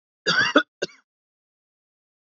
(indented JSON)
{
  "cough_length": "2.3 s",
  "cough_amplitude": 24457,
  "cough_signal_mean_std_ratio": 0.3,
  "survey_phase": "beta (2021-08-13 to 2022-03-07)",
  "age": "18-44",
  "gender": "Male",
  "wearing_mask": "No",
  "symptom_none": true,
  "smoker_status": "Ex-smoker",
  "respiratory_condition_asthma": false,
  "respiratory_condition_other": false,
  "recruitment_source": "REACT",
  "submission_delay": "1 day",
  "covid_test_result": "Negative",
  "covid_test_method": "RT-qPCR",
  "influenza_a_test_result": "Negative",
  "influenza_b_test_result": "Negative"
}